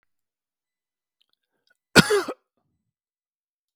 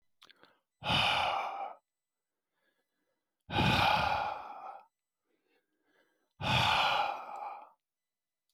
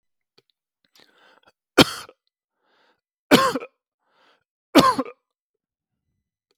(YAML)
cough_length: 3.8 s
cough_amplitude: 32768
cough_signal_mean_std_ratio: 0.18
exhalation_length: 8.5 s
exhalation_amplitude: 5603
exhalation_signal_mean_std_ratio: 0.48
three_cough_length: 6.6 s
three_cough_amplitude: 32768
three_cough_signal_mean_std_ratio: 0.22
survey_phase: beta (2021-08-13 to 2022-03-07)
age: 45-64
gender: Male
wearing_mask: 'No'
symptom_none: true
smoker_status: Ex-smoker
respiratory_condition_asthma: false
respiratory_condition_other: false
recruitment_source: REACT
submission_delay: 3 days
covid_test_result: Negative
covid_test_method: RT-qPCR
influenza_a_test_result: Unknown/Void
influenza_b_test_result: Unknown/Void